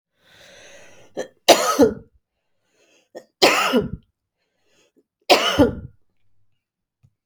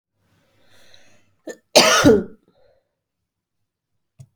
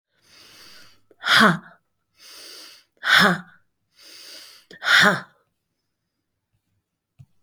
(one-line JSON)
{"three_cough_length": "7.3 s", "three_cough_amplitude": 32768, "three_cough_signal_mean_std_ratio": 0.33, "cough_length": "4.4 s", "cough_amplitude": 29209, "cough_signal_mean_std_ratio": 0.27, "exhalation_length": "7.4 s", "exhalation_amplitude": 26931, "exhalation_signal_mean_std_ratio": 0.31, "survey_phase": "beta (2021-08-13 to 2022-03-07)", "age": "45-64", "gender": "Female", "wearing_mask": "No", "symptom_cough_any": true, "symptom_runny_or_blocked_nose": true, "symptom_fatigue": true, "symptom_fever_high_temperature": true, "symptom_headache": true, "symptom_onset": "3 days", "smoker_status": "Never smoked", "respiratory_condition_asthma": false, "respiratory_condition_other": false, "recruitment_source": "Test and Trace", "submission_delay": "-26 days", "covid_test_result": "Negative", "covid_test_method": "RT-qPCR"}